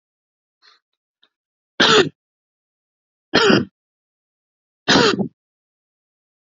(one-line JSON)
{"three_cough_length": "6.5 s", "three_cough_amplitude": 30413, "three_cough_signal_mean_std_ratio": 0.3, "survey_phase": "beta (2021-08-13 to 2022-03-07)", "age": "18-44", "gender": "Male", "wearing_mask": "No", "symptom_none": true, "symptom_onset": "5 days", "smoker_status": "Never smoked", "respiratory_condition_asthma": false, "respiratory_condition_other": true, "recruitment_source": "REACT", "submission_delay": "1 day", "covid_test_result": "Negative", "covid_test_method": "RT-qPCR", "influenza_a_test_result": "Negative", "influenza_b_test_result": "Negative"}